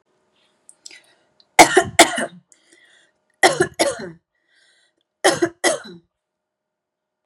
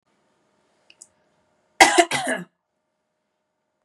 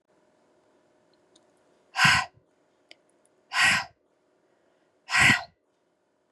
{"three_cough_length": "7.3 s", "three_cough_amplitude": 32768, "three_cough_signal_mean_std_ratio": 0.28, "cough_length": "3.8 s", "cough_amplitude": 32768, "cough_signal_mean_std_ratio": 0.23, "exhalation_length": "6.3 s", "exhalation_amplitude": 16455, "exhalation_signal_mean_std_ratio": 0.3, "survey_phase": "beta (2021-08-13 to 2022-03-07)", "age": "18-44", "gender": "Female", "wearing_mask": "No", "symptom_none": true, "symptom_onset": "2 days", "smoker_status": "Never smoked", "respiratory_condition_asthma": false, "respiratory_condition_other": false, "recruitment_source": "Test and Trace", "submission_delay": "2 days", "covid_test_result": "Positive", "covid_test_method": "RT-qPCR", "covid_ct_value": 28.6, "covid_ct_gene": "N gene"}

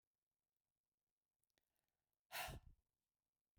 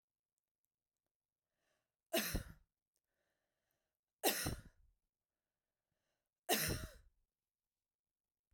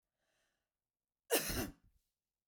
{"exhalation_length": "3.6 s", "exhalation_amplitude": 521, "exhalation_signal_mean_std_ratio": 0.24, "three_cough_length": "8.5 s", "three_cough_amplitude": 3414, "three_cough_signal_mean_std_ratio": 0.26, "cough_length": "2.5 s", "cough_amplitude": 4122, "cough_signal_mean_std_ratio": 0.29, "survey_phase": "beta (2021-08-13 to 2022-03-07)", "age": "45-64", "gender": "Female", "wearing_mask": "No", "symptom_sore_throat": true, "smoker_status": "Never smoked", "respiratory_condition_asthma": false, "respiratory_condition_other": false, "recruitment_source": "REACT", "submission_delay": "3 days", "covid_test_result": "Negative", "covid_test_method": "RT-qPCR", "influenza_a_test_result": "Negative", "influenza_b_test_result": "Negative"}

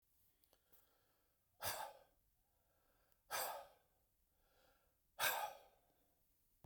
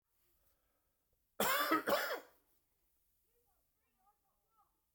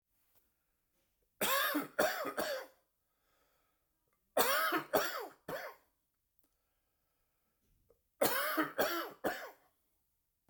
{"exhalation_length": "6.7 s", "exhalation_amplitude": 2035, "exhalation_signal_mean_std_ratio": 0.32, "cough_length": "4.9 s", "cough_amplitude": 3171, "cough_signal_mean_std_ratio": 0.31, "three_cough_length": "10.5 s", "three_cough_amplitude": 6484, "three_cough_signal_mean_std_ratio": 0.43, "survey_phase": "beta (2021-08-13 to 2022-03-07)", "age": "45-64", "gender": "Male", "wearing_mask": "No", "symptom_fatigue": true, "symptom_headache": true, "smoker_status": "Ex-smoker", "respiratory_condition_asthma": false, "respiratory_condition_other": false, "recruitment_source": "REACT", "submission_delay": "12 days", "covid_test_result": "Negative", "covid_test_method": "RT-qPCR"}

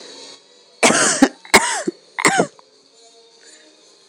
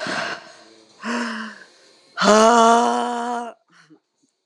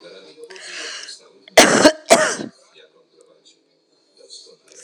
{"cough_length": "4.1 s", "cough_amplitude": 26028, "cough_signal_mean_std_ratio": 0.39, "exhalation_length": "4.5 s", "exhalation_amplitude": 26028, "exhalation_signal_mean_std_ratio": 0.45, "three_cough_length": "4.8 s", "three_cough_amplitude": 26028, "three_cough_signal_mean_std_ratio": 0.31, "survey_phase": "beta (2021-08-13 to 2022-03-07)", "age": "45-64", "gender": "Male", "wearing_mask": "No", "symptom_runny_or_blocked_nose": true, "symptom_diarrhoea": true, "smoker_status": "Current smoker (1 to 10 cigarettes per day)", "respiratory_condition_asthma": false, "respiratory_condition_other": false, "recruitment_source": "Test and Trace", "submission_delay": "0 days", "covid_test_result": "Positive", "covid_test_method": "RT-qPCR", "covid_ct_value": 21.5, "covid_ct_gene": "S gene", "covid_ct_mean": 22.3, "covid_viral_load": "50000 copies/ml", "covid_viral_load_category": "Low viral load (10K-1M copies/ml)"}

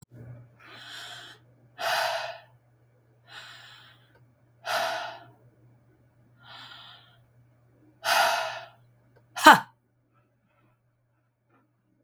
{"exhalation_length": "12.0 s", "exhalation_amplitude": 32768, "exhalation_signal_mean_std_ratio": 0.25, "survey_phase": "beta (2021-08-13 to 2022-03-07)", "age": "45-64", "gender": "Female", "wearing_mask": "No", "symptom_abdominal_pain": true, "symptom_diarrhoea": true, "symptom_onset": "18 days", "smoker_status": "Ex-smoker", "respiratory_condition_asthma": false, "respiratory_condition_other": false, "recruitment_source": "Test and Trace", "submission_delay": "1 day", "covid_test_result": "Negative", "covid_test_method": "RT-qPCR"}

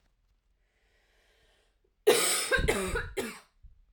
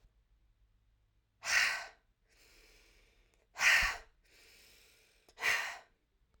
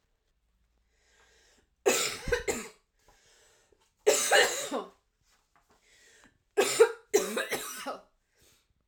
{"cough_length": "3.9 s", "cough_amplitude": 9794, "cough_signal_mean_std_ratio": 0.41, "exhalation_length": "6.4 s", "exhalation_amplitude": 5524, "exhalation_signal_mean_std_ratio": 0.33, "three_cough_length": "8.9 s", "three_cough_amplitude": 12434, "three_cough_signal_mean_std_ratio": 0.36, "survey_phase": "alpha (2021-03-01 to 2021-08-12)", "age": "18-44", "gender": "Female", "wearing_mask": "No", "symptom_cough_any": true, "symptom_fatigue": true, "symptom_headache": true, "symptom_change_to_sense_of_smell_or_taste": true, "symptom_loss_of_taste": true, "smoker_status": "Never smoked", "respiratory_condition_asthma": false, "respiratory_condition_other": false, "recruitment_source": "Test and Trace", "submission_delay": "1 day", "covid_test_result": "Positive", "covid_test_method": "RT-qPCR"}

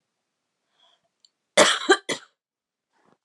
{"cough_length": "3.2 s", "cough_amplitude": 29408, "cough_signal_mean_std_ratio": 0.25, "survey_phase": "beta (2021-08-13 to 2022-03-07)", "age": "18-44", "gender": "Female", "wearing_mask": "No", "symptom_cough_any": true, "symptom_new_continuous_cough": true, "symptom_runny_or_blocked_nose": true, "symptom_sore_throat": true, "symptom_other": true, "symptom_onset": "4 days", "smoker_status": "Never smoked", "respiratory_condition_asthma": false, "respiratory_condition_other": false, "recruitment_source": "Test and Trace", "submission_delay": "3 days", "covid_test_result": "Positive", "covid_test_method": "RT-qPCR", "covid_ct_value": 21.9, "covid_ct_gene": "N gene", "covid_ct_mean": 21.9, "covid_viral_load": "63000 copies/ml", "covid_viral_load_category": "Low viral load (10K-1M copies/ml)"}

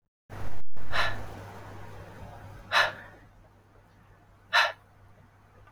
{"exhalation_length": "5.7 s", "exhalation_amplitude": 11721, "exhalation_signal_mean_std_ratio": 0.48, "survey_phase": "beta (2021-08-13 to 2022-03-07)", "age": "45-64", "gender": "Female", "wearing_mask": "No", "symptom_runny_or_blocked_nose": true, "symptom_abdominal_pain": true, "smoker_status": "Never smoked", "respiratory_condition_asthma": false, "respiratory_condition_other": false, "recruitment_source": "Test and Trace", "submission_delay": "2 days", "covid_test_result": "Negative", "covid_test_method": "RT-qPCR"}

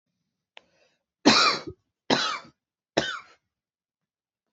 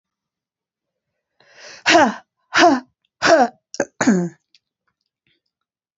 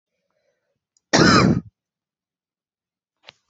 {"three_cough_length": "4.5 s", "three_cough_amplitude": 25812, "three_cough_signal_mean_std_ratio": 0.3, "exhalation_length": "6.0 s", "exhalation_amplitude": 28353, "exhalation_signal_mean_std_ratio": 0.34, "cough_length": "3.5 s", "cough_amplitude": 28416, "cough_signal_mean_std_ratio": 0.29, "survey_phase": "beta (2021-08-13 to 2022-03-07)", "age": "18-44", "gender": "Female", "wearing_mask": "No", "symptom_runny_or_blocked_nose": true, "symptom_fatigue": true, "symptom_fever_high_temperature": true, "symptom_onset": "4 days", "smoker_status": "Never smoked", "respiratory_condition_asthma": true, "respiratory_condition_other": false, "recruitment_source": "Test and Trace", "submission_delay": "2 days", "covid_test_result": "Positive", "covid_test_method": "RT-qPCR", "covid_ct_value": 23.4, "covid_ct_gene": "N gene"}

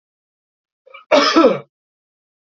{"cough_length": "2.5 s", "cough_amplitude": 28381, "cough_signal_mean_std_ratio": 0.35, "survey_phase": "alpha (2021-03-01 to 2021-08-12)", "age": "18-44", "gender": "Male", "wearing_mask": "No", "symptom_none": true, "smoker_status": "Never smoked", "respiratory_condition_asthma": false, "respiratory_condition_other": false, "recruitment_source": "REACT", "submission_delay": "1 day", "covid_test_result": "Negative", "covid_test_method": "RT-qPCR"}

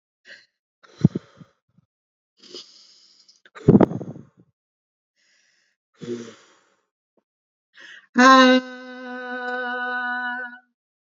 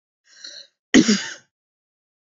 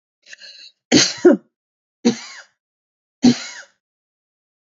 {"exhalation_length": "11.1 s", "exhalation_amplitude": 29834, "exhalation_signal_mean_std_ratio": 0.29, "cough_length": "2.3 s", "cough_amplitude": 27875, "cough_signal_mean_std_ratio": 0.27, "three_cough_length": "4.7 s", "three_cough_amplitude": 32768, "three_cough_signal_mean_std_ratio": 0.28, "survey_phase": "beta (2021-08-13 to 2022-03-07)", "age": "45-64", "gender": "Female", "wearing_mask": "No", "symptom_none": true, "smoker_status": "Ex-smoker", "respiratory_condition_asthma": false, "respiratory_condition_other": false, "recruitment_source": "REACT", "submission_delay": "2 days", "covid_test_result": "Negative", "covid_test_method": "RT-qPCR", "influenza_a_test_result": "Negative", "influenza_b_test_result": "Negative"}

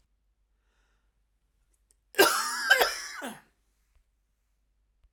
{"cough_length": "5.1 s", "cough_amplitude": 16449, "cough_signal_mean_std_ratio": 0.29, "survey_phase": "alpha (2021-03-01 to 2021-08-12)", "age": "45-64", "gender": "Female", "wearing_mask": "No", "symptom_none": true, "smoker_status": "Never smoked", "respiratory_condition_asthma": false, "respiratory_condition_other": false, "recruitment_source": "Test and Trace", "submission_delay": "98 days", "covid_test_result": "Negative", "covid_test_method": "LFT"}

